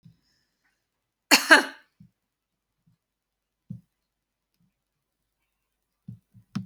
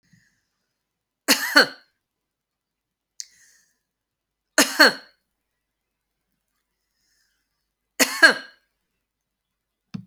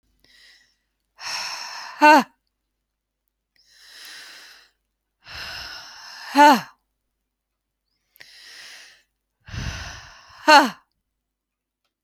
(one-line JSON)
{"cough_length": "6.7 s", "cough_amplitude": 31970, "cough_signal_mean_std_ratio": 0.16, "three_cough_length": "10.1 s", "three_cough_amplitude": 30548, "three_cough_signal_mean_std_ratio": 0.21, "exhalation_length": "12.0 s", "exhalation_amplitude": 28273, "exhalation_signal_mean_std_ratio": 0.25, "survey_phase": "beta (2021-08-13 to 2022-03-07)", "age": "45-64", "gender": "Female", "wearing_mask": "No", "symptom_none": true, "smoker_status": "Never smoked", "respiratory_condition_asthma": true, "respiratory_condition_other": false, "recruitment_source": "REACT", "submission_delay": "2 days", "covid_test_result": "Negative", "covid_test_method": "RT-qPCR"}